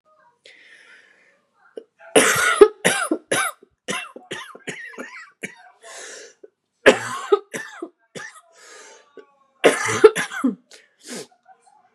three_cough_length: 11.9 s
three_cough_amplitude: 32768
three_cough_signal_mean_std_ratio: 0.32
survey_phase: beta (2021-08-13 to 2022-03-07)
age: 18-44
gender: Female
wearing_mask: 'No'
symptom_cough_any: true
symptom_new_continuous_cough: true
symptom_runny_or_blocked_nose: true
symptom_sore_throat: true
symptom_fatigue: true
symptom_headache: true
symptom_change_to_sense_of_smell_or_taste: true
symptom_other: true
symptom_onset: 3 days
smoker_status: Never smoked
respiratory_condition_asthma: true
respiratory_condition_other: false
recruitment_source: Test and Trace
submission_delay: 1 day
covid_test_result: Positive
covid_test_method: RT-qPCR
covid_ct_value: 19.9
covid_ct_gene: N gene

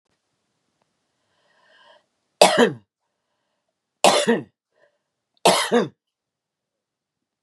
three_cough_length: 7.4 s
three_cough_amplitude: 32768
three_cough_signal_mean_std_ratio: 0.27
survey_phase: beta (2021-08-13 to 2022-03-07)
age: 45-64
gender: Female
wearing_mask: 'No'
symptom_cough_any: true
smoker_status: Current smoker (11 or more cigarettes per day)
respiratory_condition_asthma: false
respiratory_condition_other: false
recruitment_source: REACT
submission_delay: 1 day
covid_test_result: Negative
covid_test_method: RT-qPCR
influenza_a_test_result: Negative
influenza_b_test_result: Negative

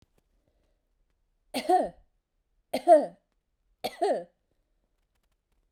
three_cough_length: 5.7 s
three_cough_amplitude: 15004
three_cough_signal_mean_std_ratio: 0.26
survey_phase: beta (2021-08-13 to 2022-03-07)
age: 45-64
gender: Female
wearing_mask: 'No'
symptom_none: true
smoker_status: Current smoker (e-cigarettes or vapes only)
respiratory_condition_asthma: false
respiratory_condition_other: false
recruitment_source: REACT
submission_delay: 3 days
covid_test_result: Negative
covid_test_method: RT-qPCR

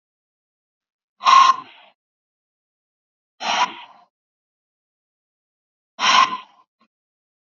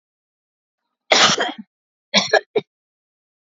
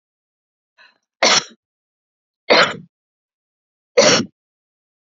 exhalation_length: 7.5 s
exhalation_amplitude: 29060
exhalation_signal_mean_std_ratio: 0.27
cough_length: 3.5 s
cough_amplitude: 32768
cough_signal_mean_std_ratio: 0.32
three_cough_length: 5.1 s
three_cough_amplitude: 32767
three_cough_signal_mean_std_ratio: 0.29
survey_phase: alpha (2021-03-01 to 2021-08-12)
age: 45-64
gender: Female
wearing_mask: 'No'
symptom_none: true
smoker_status: Never smoked
respiratory_condition_asthma: false
respiratory_condition_other: false
recruitment_source: REACT
submission_delay: 1 day
covid_test_result: Negative
covid_test_method: RT-qPCR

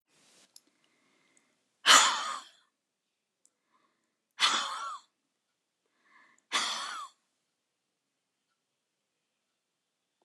exhalation_length: 10.2 s
exhalation_amplitude: 15617
exhalation_signal_mean_std_ratio: 0.24
survey_phase: alpha (2021-03-01 to 2021-08-12)
age: 65+
gender: Female
wearing_mask: 'No'
symptom_none: true
smoker_status: Never smoked
respiratory_condition_asthma: true
respiratory_condition_other: false
recruitment_source: REACT
submission_delay: 2 days
covid_test_result: Negative
covid_test_method: RT-qPCR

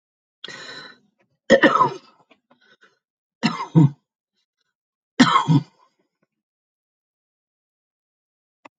three_cough_length: 8.8 s
three_cough_amplitude: 32768
three_cough_signal_mean_std_ratio: 0.27
survey_phase: alpha (2021-03-01 to 2021-08-12)
age: 65+
gender: Female
wearing_mask: 'No'
symptom_none: true
smoker_status: Ex-smoker
respiratory_condition_asthma: false
respiratory_condition_other: false
recruitment_source: REACT
submission_delay: 2 days
covid_test_result: Negative
covid_test_method: RT-qPCR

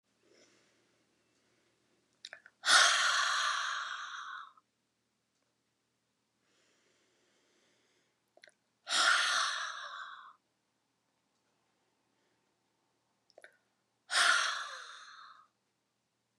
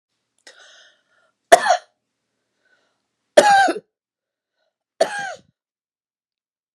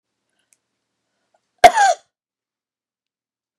exhalation_length: 16.4 s
exhalation_amplitude: 8654
exhalation_signal_mean_std_ratio: 0.34
three_cough_length: 6.7 s
three_cough_amplitude: 32768
three_cough_signal_mean_std_ratio: 0.25
cough_length: 3.6 s
cough_amplitude: 32768
cough_signal_mean_std_ratio: 0.2
survey_phase: beta (2021-08-13 to 2022-03-07)
age: 65+
gender: Female
wearing_mask: 'No'
symptom_none: true
smoker_status: Ex-smoker
respiratory_condition_asthma: false
respiratory_condition_other: false
recruitment_source: REACT
submission_delay: 2 days
covid_test_result: Negative
covid_test_method: RT-qPCR
influenza_a_test_result: Negative
influenza_b_test_result: Negative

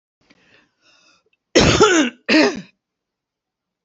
cough_length: 3.8 s
cough_amplitude: 28944
cough_signal_mean_std_ratio: 0.38
survey_phase: alpha (2021-03-01 to 2021-08-12)
age: 65+
gender: Female
wearing_mask: 'No'
symptom_none: true
smoker_status: Never smoked
respiratory_condition_asthma: false
respiratory_condition_other: false
recruitment_source: REACT
submission_delay: 2 days
covid_test_result: Negative
covid_test_method: RT-qPCR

